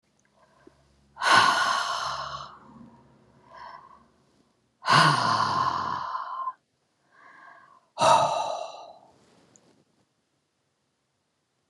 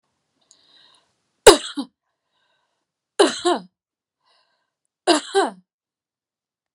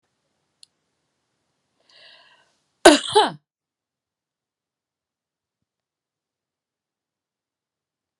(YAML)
exhalation_length: 11.7 s
exhalation_amplitude: 20301
exhalation_signal_mean_std_ratio: 0.42
three_cough_length: 6.7 s
three_cough_amplitude: 32768
three_cough_signal_mean_std_ratio: 0.22
cough_length: 8.2 s
cough_amplitude: 32768
cough_signal_mean_std_ratio: 0.14
survey_phase: beta (2021-08-13 to 2022-03-07)
age: 45-64
gender: Female
wearing_mask: 'No'
symptom_cough_any: true
symptom_shortness_of_breath: true
symptom_fatigue: true
symptom_headache: true
symptom_onset: 2 days
smoker_status: Ex-smoker
respiratory_condition_asthma: false
respiratory_condition_other: false
recruitment_source: REACT
submission_delay: 2 days
covid_test_result: Negative
covid_test_method: RT-qPCR